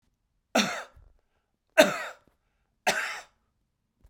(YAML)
three_cough_length: 4.1 s
three_cough_amplitude: 25307
three_cough_signal_mean_std_ratio: 0.28
survey_phase: beta (2021-08-13 to 2022-03-07)
age: 65+
gender: Male
wearing_mask: 'No'
symptom_runny_or_blocked_nose: true
smoker_status: Never smoked
respiratory_condition_asthma: false
respiratory_condition_other: false
recruitment_source: Test and Trace
submission_delay: 2 days
covid_test_result: Positive
covid_test_method: RT-qPCR